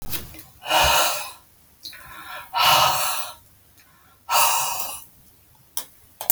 {"exhalation_length": "6.3 s", "exhalation_amplitude": 32768, "exhalation_signal_mean_std_ratio": 0.51, "survey_phase": "alpha (2021-03-01 to 2021-08-12)", "age": "45-64", "gender": "Female", "wearing_mask": "No", "symptom_none": true, "smoker_status": "Current smoker (1 to 10 cigarettes per day)", "respiratory_condition_asthma": false, "respiratory_condition_other": false, "recruitment_source": "REACT", "submission_delay": "1 day", "covid_test_result": "Negative", "covid_test_method": "RT-qPCR"}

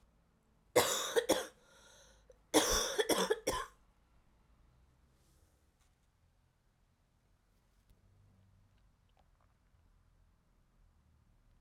{"cough_length": "11.6 s", "cough_amplitude": 8448, "cough_signal_mean_std_ratio": 0.29, "survey_phase": "alpha (2021-03-01 to 2021-08-12)", "age": "18-44", "gender": "Female", "wearing_mask": "No", "symptom_cough_any": true, "symptom_shortness_of_breath": true, "symptom_fatigue": true, "symptom_fever_high_temperature": true, "symptom_headache": true, "symptom_change_to_sense_of_smell_or_taste": true, "symptom_onset": "3 days", "smoker_status": "Never smoked", "respiratory_condition_asthma": false, "respiratory_condition_other": false, "recruitment_source": "Test and Trace", "submission_delay": "2 days", "covid_test_result": "Positive", "covid_test_method": "RT-qPCR", "covid_ct_value": 26.0, "covid_ct_gene": "ORF1ab gene"}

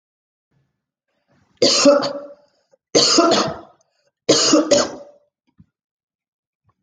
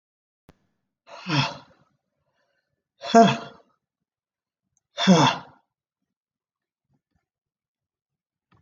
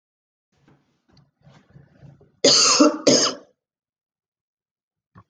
{"three_cough_length": "6.8 s", "three_cough_amplitude": 28448, "three_cough_signal_mean_std_ratio": 0.41, "exhalation_length": "8.6 s", "exhalation_amplitude": 23477, "exhalation_signal_mean_std_ratio": 0.24, "cough_length": "5.3 s", "cough_amplitude": 25636, "cough_signal_mean_std_ratio": 0.31, "survey_phase": "beta (2021-08-13 to 2022-03-07)", "age": "45-64", "gender": "Female", "wearing_mask": "No", "symptom_none": true, "smoker_status": "Never smoked", "respiratory_condition_asthma": false, "respiratory_condition_other": false, "recruitment_source": "REACT", "submission_delay": "1 day", "covid_test_result": "Negative", "covid_test_method": "RT-qPCR"}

